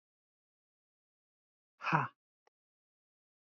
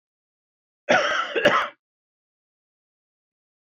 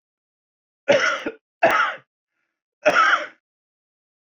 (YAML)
exhalation_length: 3.5 s
exhalation_amplitude: 6405
exhalation_signal_mean_std_ratio: 0.19
cough_length: 3.8 s
cough_amplitude: 19112
cough_signal_mean_std_ratio: 0.33
three_cough_length: 4.4 s
three_cough_amplitude: 21246
three_cough_signal_mean_std_ratio: 0.39
survey_phase: beta (2021-08-13 to 2022-03-07)
age: 45-64
gender: Male
wearing_mask: 'No'
symptom_none: true
smoker_status: Current smoker (e-cigarettes or vapes only)
respiratory_condition_asthma: false
respiratory_condition_other: false
recruitment_source: REACT
submission_delay: 1 day
covid_test_result: Negative
covid_test_method: RT-qPCR
influenza_a_test_result: Negative
influenza_b_test_result: Negative